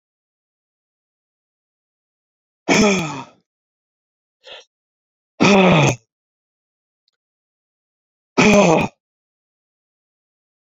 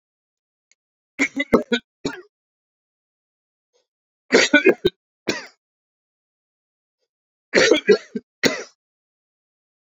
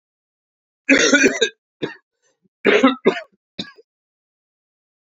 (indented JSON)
{
  "exhalation_length": "10.7 s",
  "exhalation_amplitude": 31528,
  "exhalation_signal_mean_std_ratio": 0.3,
  "three_cough_length": "10.0 s",
  "three_cough_amplitude": 29229,
  "three_cough_signal_mean_std_ratio": 0.27,
  "cough_length": "5.0 s",
  "cough_amplitude": 30627,
  "cough_signal_mean_std_ratio": 0.35,
  "survey_phase": "beta (2021-08-13 to 2022-03-07)",
  "age": "65+",
  "gender": "Male",
  "wearing_mask": "No",
  "symptom_cough_any": true,
  "symptom_runny_or_blocked_nose": true,
  "symptom_other": true,
  "symptom_onset": "4 days",
  "smoker_status": "Never smoked",
  "respiratory_condition_asthma": false,
  "respiratory_condition_other": false,
  "recruitment_source": "Test and Trace",
  "submission_delay": "2 days",
  "covid_test_result": "Positive",
  "covid_test_method": "RT-qPCR"
}